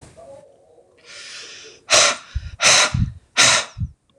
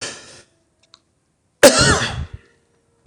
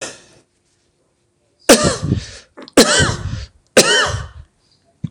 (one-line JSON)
{"exhalation_length": "4.2 s", "exhalation_amplitude": 26028, "exhalation_signal_mean_std_ratio": 0.45, "cough_length": "3.1 s", "cough_amplitude": 26028, "cough_signal_mean_std_ratio": 0.32, "three_cough_length": "5.1 s", "three_cough_amplitude": 26028, "three_cough_signal_mean_std_ratio": 0.41, "survey_phase": "beta (2021-08-13 to 2022-03-07)", "age": "45-64", "gender": "Male", "wearing_mask": "No", "symptom_none": true, "smoker_status": "Ex-smoker", "respiratory_condition_asthma": false, "respiratory_condition_other": false, "recruitment_source": "REACT", "submission_delay": "4 days", "covid_test_result": "Negative", "covid_test_method": "RT-qPCR", "influenza_a_test_result": "Unknown/Void", "influenza_b_test_result": "Unknown/Void"}